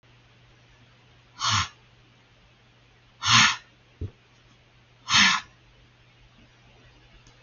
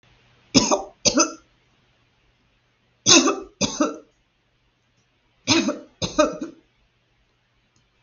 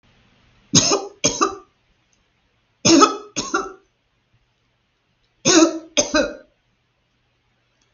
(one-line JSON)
{"exhalation_length": "7.4 s", "exhalation_amplitude": 18694, "exhalation_signal_mean_std_ratio": 0.3, "three_cough_length": "8.0 s", "three_cough_amplitude": 32768, "three_cough_signal_mean_std_ratio": 0.33, "cough_length": "7.9 s", "cough_amplitude": 32768, "cough_signal_mean_std_ratio": 0.34, "survey_phase": "beta (2021-08-13 to 2022-03-07)", "age": "65+", "gender": "Female", "wearing_mask": "No", "symptom_none": true, "smoker_status": "Never smoked", "respiratory_condition_asthma": false, "respiratory_condition_other": false, "recruitment_source": "REACT", "submission_delay": "2 days", "covid_test_result": "Negative", "covid_test_method": "RT-qPCR", "influenza_a_test_result": "Negative", "influenza_b_test_result": "Negative"}